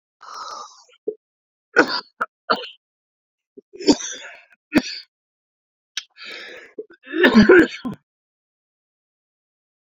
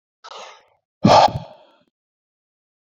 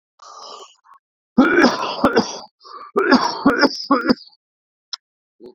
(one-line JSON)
{"three_cough_length": "9.8 s", "three_cough_amplitude": 32767, "three_cough_signal_mean_std_ratio": 0.29, "exhalation_length": "2.9 s", "exhalation_amplitude": 31019, "exhalation_signal_mean_std_ratio": 0.27, "cough_length": "5.5 s", "cough_amplitude": 30593, "cough_signal_mean_std_ratio": 0.45, "survey_phase": "beta (2021-08-13 to 2022-03-07)", "age": "18-44", "gender": "Male", "wearing_mask": "No", "symptom_fatigue": true, "symptom_onset": "8 days", "smoker_status": "Ex-smoker", "respiratory_condition_asthma": true, "respiratory_condition_other": false, "recruitment_source": "REACT", "submission_delay": "1 day", "covid_test_result": "Negative", "covid_test_method": "RT-qPCR"}